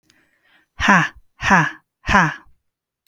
{"exhalation_length": "3.1 s", "exhalation_amplitude": 32768, "exhalation_signal_mean_std_ratio": 0.41, "survey_phase": "beta (2021-08-13 to 2022-03-07)", "age": "18-44", "gender": "Female", "wearing_mask": "No", "symptom_none": true, "smoker_status": "Never smoked", "respiratory_condition_asthma": false, "respiratory_condition_other": false, "recruitment_source": "REACT", "submission_delay": "3 days", "covid_test_result": "Negative", "covid_test_method": "RT-qPCR", "influenza_a_test_result": "Negative", "influenza_b_test_result": "Negative"}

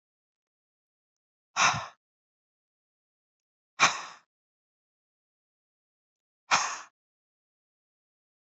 {"exhalation_length": "8.5 s", "exhalation_amplitude": 14059, "exhalation_signal_mean_std_ratio": 0.2, "survey_phase": "beta (2021-08-13 to 2022-03-07)", "age": "45-64", "gender": "Female", "wearing_mask": "No", "symptom_none": true, "smoker_status": "Never smoked", "respiratory_condition_asthma": false, "respiratory_condition_other": false, "recruitment_source": "REACT", "submission_delay": "2 days", "covid_test_result": "Negative", "covid_test_method": "RT-qPCR"}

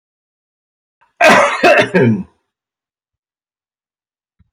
{"cough_length": "4.5 s", "cough_amplitude": 32759, "cough_signal_mean_std_ratio": 0.37, "survey_phase": "beta (2021-08-13 to 2022-03-07)", "age": "65+", "gender": "Male", "wearing_mask": "No", "symptom_runny_or_blocked_nose": true, "symptom_headache": true, "symptom_onset": "9 days", "smoker_status": "Never smoked", "respiratory_condition_asthma": false, "respiratory_condition_other": false, "recruitment_source": "REACT", "submission_delay": "2 days", "covid_test_result": "Negative", "covid_test_method": "RT-qPCR"}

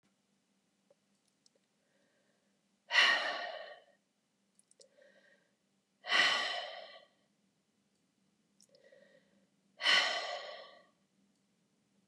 {"exhalation_length": "12.1 s", "exhalation_amplitude": 6909, "exhalation_signal_mean_std_ratio": 0.3, "survey_phase": "beta (2021-08-13 to 2022-03-07)", "age": "65+", "gender": "Female", "wearing_mask": "No", "symptom_cough_any": true, "smoker_status": "Ex-smoker", "respiratory_condition_asthma": false, "respiratory_condition_other": false, "recruitment_source": "REACT", "submission_delay": "1 day", "covid_test_result": "Negative", "covid_test_method": "RT-qPCR", "influenza_a_test_result": "Negative", "influenza_b_test_result": "Negative"}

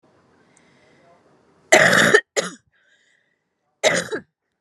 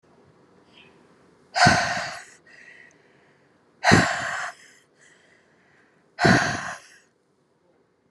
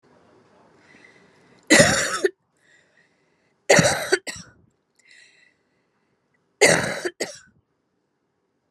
{"cough_length": "4.6 s", "cough_amplitude": 32768, "cough_signal_mean_std_ratio": 0.32, "exhalation_length": "8.1 s", "exhalation_amplitude": 29720, "exhalation_signal_mean_std_ratio": 0.34, "three_cough_length": "8.7 s", "three_cough_amplitude": 32472, "three_cough_signal_mean_std_ratio": 0.3, "survey_phase": "beta (2021-08-13 to 2022-03-07)", "age": "45-64", "gender": "Female", "wearing_mask": "No", "symptom_cough_any": true, "symptom_runny_or_blocked_nose": true, "symptom_shortness_of_breath": true, "symptom_sore_throat": true, "symptom_fatigue": true, "symptom_headache": true, "symptom_change_to_sense_of_smell_or_taste": true, "symptom_loss_of_taste": true, "smoker_status": "Never smoked", "respiratory_condition_asthma": false, "respiratory_condition_other": false, "recruitment_source": "Test and Trace", "submission_delay": "3 days", "covid_test_method": "PCR", "covid_ct_value": 40.9, "covid_ct_gene": "N gene"}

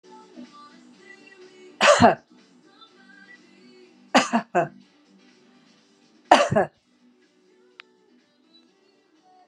{"three_cough_length": "9.5 s", "three_cough_amplitude": 32767, "three_cough_signal_mean_std_ratio": 0.26, "survey_phase": "beta (2021-08-13 to 2022-03-07)", "age": "65+", "gender": "Female", "wearing_mask": "No", "symptom_other": true, "smoker_status": "Ex-smoker", "respiratory_condition_asthma": false, "respiratory_condition_other": false, "recruitment_source": "REACT", "submission_delay": "6 days", "covid_test_result": "Negative", "covid_test_method": "RT-qPCR"}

